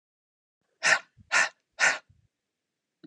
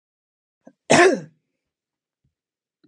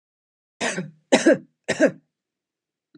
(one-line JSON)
{"exhalation_length": "3.1 s", "exhalation_amplitude": 13507, "exhalation_signal_mean_std_ratio": 0.31, "cough_length": "2.9 s", "cough_amplitude": 29521, "cough_signal_mean_std_ratio": 0.25, "three_cough_length": "3.0 s", "three_cough_amplitude": 26044, "three_cough_signal_mean_std_ratio": 0.32, "survey_phase": "alpha (2021-03-01 to 2021-08-12)", "age": "45-64", "gender": "Female", "wearing_mask": "No", "symptom_none": true, "symptom_onset": "12 days", "smoker_status": "Never smoked", "respiratory_condition_asthma": false, "respiratory_condition_other": false, "recruitment_source": "REACT", "submission_delay": "1 day", "covid_test_result": "Negative", "covid_test_method": "RT-qPCR"}